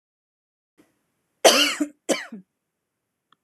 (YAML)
cough_length: 3.4 s
cough_amplitude: 26165
cough_signal_mean_std_ratio: 0.27
survey_phase: alpha (2021-03-01 to 2021-08-12)
age: 45-64
gender: Female
wearing_mask: 'No'
symptom_none: true
smoker_status: Never smoked
respiratory_condition_asthma: false
respiratory_condition_other: false
recruitment_source: REACT
submission_delay: 3 days
covid_test_result: Negative
covid_test_method: RT-qPCR